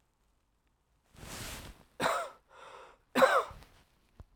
{
  "cough_length": "4.4 s",
  "cough_amplitude": 11026,
  "cough_signal_mean_std_ratio": 0.32,
  "survey_phase": "alpha (2021-03-01 to 2021-08-12)",
  "age": "18-44",
  "gender": "Male",
  "wearing_mask": "No",
  "symptom_fatigue": true,
  "symptom_headache": true,
  "symptom_loss_of_taste": true,
  "symptom_onset": "4 days",
  "smoker_status": "Ex-smoker",
  "respiratory_condition_asthma": false,
  "respiratory_condition_other": false,
  "recruitment_source": "Test and Trace",
  "submission_delay": "2 days",
  "covid_test_result": "Positive",
  "covid_test_method": "RT-qPCR",
  "covid_ct_value": 29.1,
  "covid_ct_gene": "N gene"
}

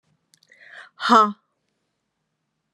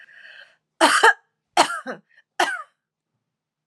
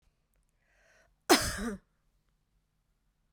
{
  "exhalation_length": "2.7 s",
  "exhalation_amplitude": 25910,
  "exhalation_signal_mean_std_ratio": 0.25,
  "three_cough_length": "3.7 s",
  "three_cough_amplitude": 31724,
  "three_cough_signal_mean_std_ratio": 0.33,
  "cough_length": "3.3 s",
  "cough_amplitude": 12785,
  "cough_signal_mean_std_ratio": 0.23,
  "survey_phase": "alpha (2021-03-01 to 2021-08-12)",
  "age": "45-64",
  "gender": "Female",
  "wearing_mask": "No",
  "symptom_change_to_sense_of_smell_or_taste": true,
  "symptom_onset": "7 days",
  "smoker_status": "Ex-smoker",
  "respiratory_condition_asthma": false,
  "respiratory_condition_other": false,
  "recruitment_source": "Test and Trace",
  "submission_delay": "3 days",
  "covid_test_result": "Positive",
  "covid_test_method": "RT-qPCR",
  "covid_ct_value": 26.4,
  "covid_ct_gene": "ORF1ab gene",
  "covid_ct_mean": 27.3,
  "covid_viral_load": "1100 copies/ml",
  "covid_viral_load_category": "Minimal viral load (< 10K copies/ml)"
}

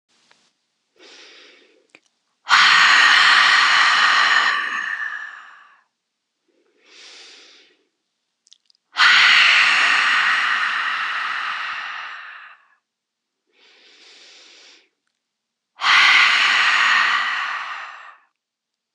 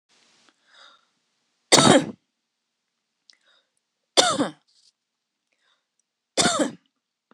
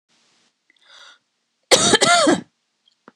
{
  "exhalation_length": "18.9 s",
  "exhalation_amplitude": 26028,
  "exhalation_signal_mean_std_ratio": 0.53,
  "three_cough_length": "7.3 s",
  "three_cough_amplitude": 26028,
  "three_cough_signal_mean_std_ratio": 0.26,
  "cough_length": "3.2 s",
  "cough_amplitude": 26028,
  "cough_signal_mean_std_ratio": 0.37,
  "survey_phase": "beta (2021-08-13 to 2022-03-07)",
  "age": "18-44",
  "gender": "Female",
  "wearing_mask": "No",
  "symptom_none": true,
  "smoker_status": "Never smoked",
  "respiratory_condition_asthma": false,
  "respiratory_condition_other": false,
  "recruitment_source": "REACT",
  "submission_delay": "0 days",
  "covid_test_result": "Negative",
  "covid_test_method": "RT-qPCR",
  "influenza_a_test_result": "Negative",
  "influenza_b_test_result": "Negative"
}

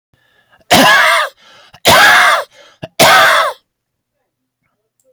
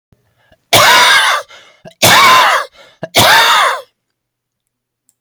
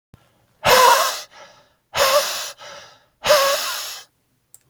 {
  "three_cough_length": "5.1 s",
  "three_cough_amplitude": 32768,
  "three_cough_signal_mean_std_ratio": 0.53,
  "cough_length": "5.2 s",
  "cough_amplitude": 32768,
  "cough_signal_mean_std_ratio": 0.58,
  "exhalation_length": "4.7 s",
  "exhalation_amplitude": 29773,
  "exhalation_signal_mean_std_ratio": 0.47,
  "survey_phase": "alpha (2021-03-01 to 2021-08-12)",
  "age": "45-64",
  "gender": "Male",
  "wearing_mask": "No",
  "symptom_cough_any": true,
  "symptom_shortness_of_breath": true,
  "symptom_fatigue": true,
  "smoker_status": "Never smoked",
  "respiratory_condition_asthma": false,
  "respiratory_condition_other": false,
  "recruitment_source": "REACT",
  "submission_delay": "2 days",
  "covid_test_result": "Negative",
  "covid_test_method": "RT-qPCR"
}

